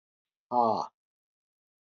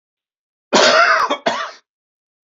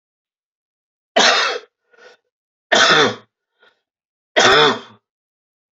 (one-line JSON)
{"exhalation_length": "1.9 s", "exhalation_amplitude": 7952, "exhalation_signal_mean_std_ratio": 0.32, "cough_length": "2.6 s", "cough_amplitude": 30510, "cough_signal_mean_std_ratio": 0.46, "three_cough_length": "5.7 s", "three_cough_amplitude": 32338, "three_cough_signal_mean_std_ratio": 0.38, "survey_phase": "beta (2021-08-13 to 2022-03-07)", "age": "65+", "gender": "Male", "wearing_mask": "No", "symptom_cough_any": true, "symptom_runny_or_blocked_nose": true, "symptom_fatigue": true, "symptom_fever_high_temperature": true, "symptom_headache": true, "symptom_change_to_sense_of_smell_or_taste": true, "symptom_onset": "3 days", "smoker_status": "Ex-smoker", "respiratory_condition_asthma": false, "respiratory_condition_other": false, "recruitment_source": "Test and Trace", "submission_delay": "2 days", "covid_test_result": "Positive", "covid_test_method": "RT-qPCR"}